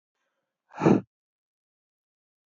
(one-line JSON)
{"exhalation_length": "2.5 s", "exhalation_amplitude": 14265, "exhalation_signal_mean_std_ratio": 0.21, "survey_phase": "beta (2021-08-13 to 2022-03-07)", "age": "18-44", "gender": "Male", "wearing_mask": "No", "symptom_cough_any": true, "symptom_sore_throat": true, "smoker_status": "Never smoked", "respiratory_condition_asthma": false, "respiratory_condition_other": false, "recruitment_source": "Test and Trace", "submission_delay": "2 days", "covid_test_result": "Positive", "covid_test_method": "RT-qPCR", "covid_ct_value": 14.8, "covid_ct_gene": "ORF1ab gene"}